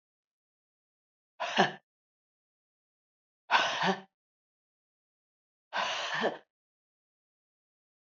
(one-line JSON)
{"exhalation_length": "8.0 s", "exhalation_amplitude": 11174, "exhalation_signal_mean_std_ratio": 0.3, "survey_phase": "alpha (2021-03-01 to 2021-08-12)", "age": "45-64", "gender": "Female", "wearing_mask": "No", "symptom_none": true, "smoker_status": "Never smoked", "respiratory_condition_asthma": false, "respiratory_condition_other": false, "recruitment_source": "REACT", "submission_delay": "1 day", "covid_test_result": "Negative", "covid_test_method": "RT-qPCR"}